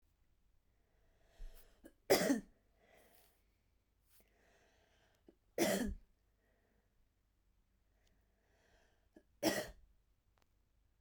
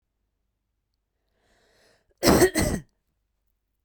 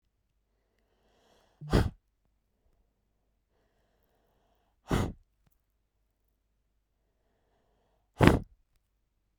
{"three_cough_length": "11.0 s", "three_cough_amplitude": 4445, "three_cough_signal_mean_std_ratio": 0.25, "cough_length": "3.8 s", "cough_amplitude": 22221, "cough_signal_mean_std_ratio": 0.28, "exhalation_length": "9.4 s", "exhalation_amplitude": 32768, "exhalation_signal_mean_std_ratio": 0.18, "survey_phase": "beta (2021-08-13 to 2022-03-07)", "age": "18-44", "gender": "Female", "wearing_mask": "No", "symptom_none": true, "smoker_status": "Never smoked", "respiratory_condition_asthma": false, "respiratory_condition_other": false, "recruitment_source": "REACT", "submission_delay": "1 day", "covid_test_result": "Negative", "covid_test_method": "RT-qPCR"}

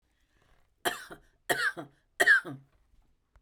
{"three_cough_length": "3.4 s", "three_cough_amplitude": 10583, "three_cough_signal_mean_std_ratio": 0.32, "survey_phase": "beta (2021-08-13 to 2022-03-07)", "age": "45-64", "gender": "Female", "wearing_mask": "No", "symptom_none": true, "smoker_status": "Ex-smoker", "respiratory_condition_asthma": false, "respiratory_condition_other": false, "recruitment_source": "REACT", "submission_delay": "2 days", "covid_test_result": "Negative", "covid_test_method": "RT-qPCR"}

